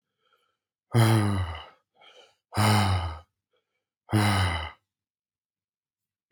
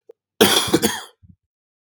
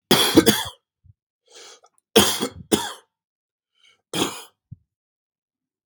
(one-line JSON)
{"exhalation_length": "6.3 s", "exhalation_amplitude": 11327, "exhalation_signal_mean_std_ratio": 0.44, "cough_length": "1.9 s", "cough_amplitude": 32768, "cough_signal_mean_std_ratio": 0.4, "three_cough_length": "5.9 s", "three_cough_amplitude": 32768, "three_cough_signal_mean_std_ratio": 0.31, "survey_phase": "beta (2021-08-13 to 2022-03-07)", "age": "18-44", "gender": "Male", "wearing_mask": "No", "symptom_cough_any": true, "symptom_new_continuous_cough": true, "symptom_runny_or_blocked_nose": true, "symptom_sore_throat": true, "symptom_diarrhoea": true, "symptom_headache": true, "symptom_onset": "4 days", "smoker_status": "Never smoked", "respiratory_condition_asthma": false, "respiratory_condition_other": false, "recruitment_source": "REACT", "submission_delay": "1 day", "covid_test_result": "Positive", "covid_test_method": "RT-qPCR", "covid_ct_value": 18.0, "covid_ct_gene": "E gene", "influenza_a_test_result": "Negative", "influenza_b_test_result": "Negative"}